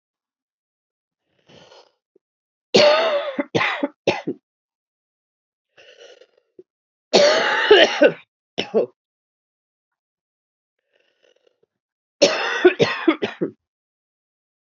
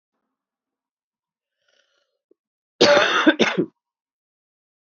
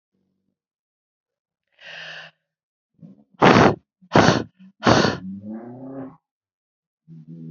three_cough_length: 14.7 s
three_cough_amplitude: 31551
three_cough_signal_mean_std_ratio: 0.34
cough_length: 4.9 s
cough_amplitude: 26363
cough_signal_mean_std_ratio: 0.29
exhalation_length: 7.5 s
exhalation_amplitude: 32767
exhalation_signal_mean_std_ratio: 0.31
survey_phase: beta (2021-08-13 to 2022-03-07)
age: 45-64
gender: Female
wearing_mask: 'No'
symptom_cough_any: true
symptom_runny_or_blocked_nose: true
symptom_sore_throat: true
symptom_headache: true
symptom_change_to_sense_of_smell_or_taste: true
symptom_onset: 4 days
smoker_status: Ex-smoker
respiratory_condition_asthma: false
respiratory_condition_other: false
recruitment_source: Test and Trace
submission_delay: 2 days
covid_test_result: Positive
covid_test_method: RT-qPCR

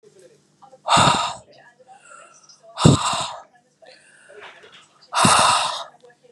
exhalation_length: 6.3 s
exhalation_amplitude: 32767
exhalation_signal_mean_std_ratio: 0.4
survey_phase: beta (2021-08-13 to 2022-03-07)
age: 45-64
gender: Female
wearing_mask: 'No'
symptom_sore_throat: true
symptom_headache: true
smoker_status: Ex-smoker
respiratory_condition_asthma: false
respiratory_condition_other: false
recruitment_source: REACT
submission_delay: 2 days
covid_test_result: Negative
covid_test_method: RT-qPCR
influenza_a_test_result: Negative
influenza_b_test_result: Negative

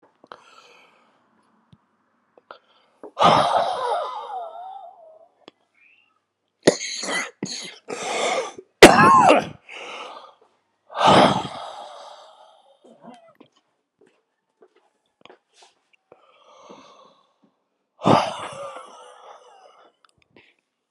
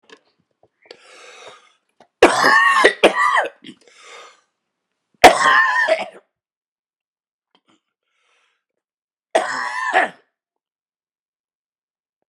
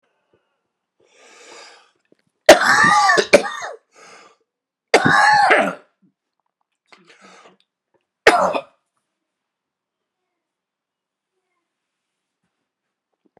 exhalation_length: 20.9 s
exhalation_amplitude: 32768
exhalation_signal_mean_std_ratio: 0.3
three_cough_length: 12.3 s
three_cough_amplitude: 32768
three_cough_signal_mean_std_ratio: 0.34
cough_length: 13.4 s
cough_amplitude: 32768
cough_signal_mean_std_ratio: 0.3
survey_phase: beta (2021-08-13 to 2022-03-07)
age: 65+
gender: Female
wearing_mask: 'Yes'
symptom_cough_any: true
symptom_runny_or_blocked_nose: true
symptom_shortness_of_breath: true
symptom_sore_throat: true
symptom_abdominal_pain: true
symptom_diarrhoea: true
symptom_fatigue: true
symptom_fever_high_temperature: true
symptom_headache: true
symptom_change_to_sense_of_smell_or_taste: true
symptom_loss_of_taste: true
smoker_status: Never smoked
respiratory_condition_asthma: true
respiratory_condition_other: false
recruitment_source: Test and Trace
submission_delay: 3 days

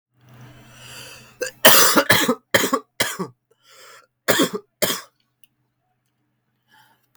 cough_length: 7.2 s
cough_amplitude: 32768
cough_signal_mean_std_ratio: 0.34
survey_phase: beta (2021-08-13 to 2022-03-07)
age: 18-44
gender: Male
wearing_mask: 'No'
symptom_cough_any: true
symptom_new_continuous_cough: true
symptom_runny_or_blocked_nose: true
symptom_shortness_of_breath: true
symptom_sore_throat: true
symptom_fever_high_temperature: true
symptom_headache: true
symptom_change_to_sense_of_smell_or_taste: true
symptom_loss_of_taste: true
symptom_other: true
symptom_onset: 5 days
smoker_status: Current smoker (1 to 10 cigarettes per day)
respiratory_condition_asthma: false
respiratory_condition_other: false
recruitment_source: Test and Trace
submission_delay: 1 day
covid_test_result: Positive
covid_test_method: RT-qPCR
covid_ct_value: 36.1
covid_ct_gene: ORF1ab gene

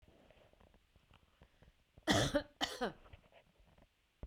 cough_length: 4.3 s
cough_amplitude: 4412
cough_signal_mean_std_ratio: 0.31
survey_phase: beta (2021-08-13 to 2022-03-07)
age: 45-64
gender: Female
wearing_mask: 'No'
symptom_none: true
smoker_status: Never smoked
respiratory_condition_asthma: false
respiratory_condition_other: false
recruitment_source: REACT
submission_delay: 1 day
covid_test_result: Negative
covid_test_method: RT-qPCR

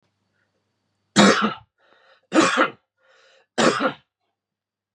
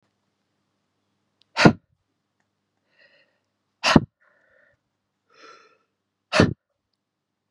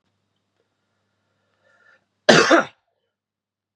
three_cough_length: 4.9 s
three_cough_amplitude: 31054
three_cough_signal_mean_std_ratio: 0.35
exhalation_length: 7.5 s
exhalation_amplitude: 32768
exhalation_signal_mean_std_ratio: 0.18
cough_length: 3.8 s
cough_amplitude: 32767
cough_signal_mean_std_ratio: 0.23
survey_phase: beta (2021-08-13 to 2022-03-07)
age: 18-44
gender: Male
wearing_mask: 'No'
symptom_cough_any: true
symptom_runny_or_blocked_nose: true
symptom_diarrhoea: true
symptom_fatigue: true
symptom_headache: true
symptom_other: true
symptom_onset: 7 days
smoker_status: Never smoked
respiratory_condition_asthma: false
respiratory_condition_other: false
recruitment_source: Test and Trace
submission_delay: 2 days
covid_test_result: Positive
covid_test_method: RT-qPCR
covid_ct_value: 23.7
covid_ct_gene: ORF1ab gene
covid_ct_mean: 24.1
covid_viral_load: 12000 copies/ml
covid_viral_load_category: Low viral load (10K-1M copies/ml)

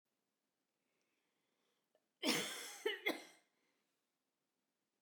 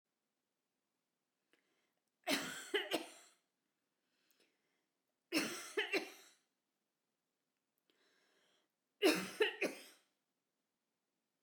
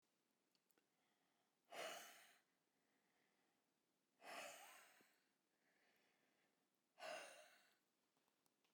cough_length: 5.0 s
cough_amplitude: 2324
cough_signal_mean_std_ratio: 0.29
three_cough_length: 11.4 s
three_cough_amplitude: 3296
three_cough_signal_mean_std_ratio: 0.29
exhalation_length: 8.7 s
exhalation_amplitude: 355
exhalation_signal_mean_std_ratio: 0.38
survey_phase: beta (2021-08-13 to 2022-03-07)
age: 45-64
gender: Female
wearing_mask: 'No'
symptom_none: true
smoker_status: Ex-smoker
respiratory_condition_asthma: false
respiratory_condition_other: false
recruitment_source: REACT
submission_delay: 2 days
covid_test_result: Negative
covid_test_method: RT-qPCR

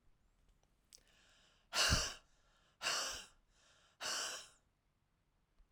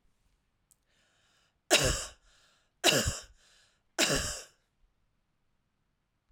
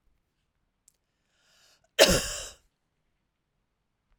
exhalation_length: 5.7 s
exhalation_amplitude: 3164
exhalation_signal_mean_std_ratio: 0.36
three_cough_length: 6.3 s
three_cough_amplitude: 11553
three_cough_signal_mean_std_ratio: 0.31
cough_length: 4.2 s
cough_amplitude: 24406
cough_signal_mean_std_ratio: 0.2
survey_phase: alpha (2021-03-01 to 2021-08-12)
age: 45-64
gender: Female
wearing_mask: 'No'
symptom_none: true
smoker_status: Ex-smoker
respiratory_condition_asthma: false
respiratory_condition_other: false
recruitment_source: REACT
submission_delay: 2 days
covid_test_result: Negative
covid_test_method: RT-qPCR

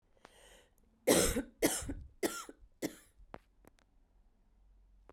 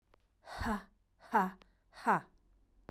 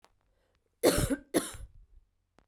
three_cough_length: 5.1 s
three_cough_amplitude: 7652
three_cough_signal_mean_std_ratio: 0.33
exhalation_length: 2.9 s
exhalation_amplitude: 4710
exhalation_signal_mean_std_ratio: 0.37
cough_length: 2.5 s
cough_amplitude: 10386
cough_signal_mean_std_ratio: 0.34
survey_phase: beta (2021-08-13 to 2022-03-07)
age: 18-44
gender: Female
wearing_mask: 'No'
symptom_cough_any: true
symptom_runny_or_blocked_nose: true
symptom_shortness_of_breath: true
symptom_sore_throat: true
symptom_diarrhoea: true
symptom_fatigue: true
symptom_change_to_sense_of_smell_or_taste: true
symptom_loss_of_taste: true
symptom_onset: 4 days
smoker_status: Ex-smoker
respiratory_condition_asthma: false
respiratory_condition_other: false
recruitment_source: Test and Trace
submission_delay: 2 days
covid_test_result: Positive
covid_test_method: RT-qPCR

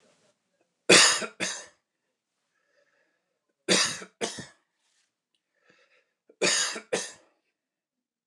three_cough_length: 8.3 s
three_cough_amplitude: 22045
three_cough_signal_mean_std_ratio: 0.28
survey_phase: beta (2021-08-13 to 2022-03-07)
age: 45-64
gender: Male
wearing_mask: 'No'
symptom_none: true
symptom_onset: 12 days
smoker_status: Never smoked
respiratory_condition_asthma: true
respiratory_condition_other: false
recruitment_source: REACT
submission_delay: 1 day
covid_test_result: Negative
covid_test_method: RT-qPCR
influenza_a_test_result: Negative
influenza_b_test_result: Negative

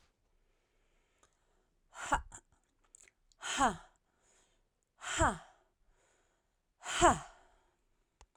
exhalation_length: 8.4 s
exhalation_amplitude: 7424
exhalation_signal_mean_std_ratio: 0.26
survey_phase: alpha (2021-03-01 to 2021-08-12)
age: 45-64
gender: Female
wearing_mask: 'No'
symptom_none: true
smoker_status: Ex-smoker
respiratory_condition_asthma: false
respiratory_condition_other: false
recruitment_source: REACT
submission_delay: 4 days
covid_test_method: RT-qPCR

